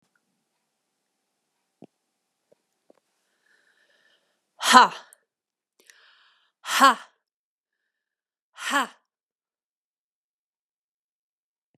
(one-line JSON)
{"exhalation_length": "11.8 s", "exhalation_amplitude": 32768, "exhalation_signal_mean_std_ratio": 0.17, "survey_phase": "beta (2021-08-13 to 2022-03-07)", "age": "18-44", "gender": "Female", "wearing_mask": "No", "symptom_none": true, "smoker_status": "Never smoked", "respiratory_condition_asthma": false, "respiratory_condition_other": false, "recruitment_source": "REACT", "submission_delay": "1 day", "covid_test_result": "Negative", "covid_test_method": "RT-qPCR"}